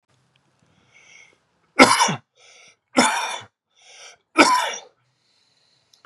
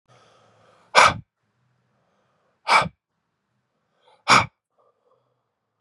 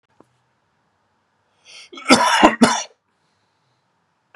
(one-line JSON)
{"three_cough_length": "6.1 s", "three_cough_amplitude": 32768, "three_cough_signal_mean_std_ratio": 0.31, "exhalation_length": "5.8 s", "exhalation_amplitude": 32768, "exhalation_signal_mean_std_ratio": 0.23, "cough_length": "4.4 s", "cough_amplitude": 32768, "cough_signal_mean_std_ratio": 0.29, "survey_phase": "beta (2021-08-13 to 2022-03-07)", "age": "18-44", "gender": "Male", "wearing_mask": "No", "symptom_runny_or_blocked_nose": true, "symptom_fatigue": true, "symptom_headache": true, "symptom_other": true, "symptom_onset": "4 days", "smoker_status": "Ex-smoker", "respiratory_condition_asthma": false, "respiratory_condition_other": false, "recruitment_source": "Test and Trace", "submission_delay": "1 day", "covid_test_result": "Positive", "covid_test_method": "RT-qPCR", "covid_ct_value": 23.0, "covid_ct_gene": "N gene", "covid_ct_mean": 23.4, "covid_viral_load": "21000 copies/ml", "covid_viral_load_category": "Low viral load (10K-1M copies/ml)"}